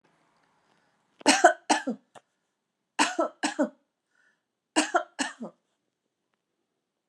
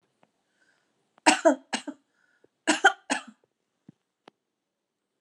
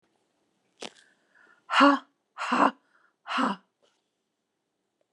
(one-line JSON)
{"three_cough_length": "7.1 s", "three_cough_amplitude": 21850, "three_cough_signal_mean_std_ratio": 0.28, "cough_length": "5.2 s", "cough_amplitude": 20807, "cough_signal_mean_std_ratio": 0.23, "exhalation_length": "5.1 s", "exhalation_amplitude": 17971, "exhalation_signal_mean_std_ratio": 0.29, "survey_phase": "alpha (2021-03-01 to 2021-08-12)", "age": "65+", "gender": "Female", "wearing_mask": "No", "symptom_none": true, "smoker_status": "Never smoked", "respiratory_condition_asthma": false, "respiratory_condition_other": false, "recruitment_source": "REACT", "submission_delay": "2 days", "covid_test_result": "Negative", "covid_test_method": "RT-qPCR"}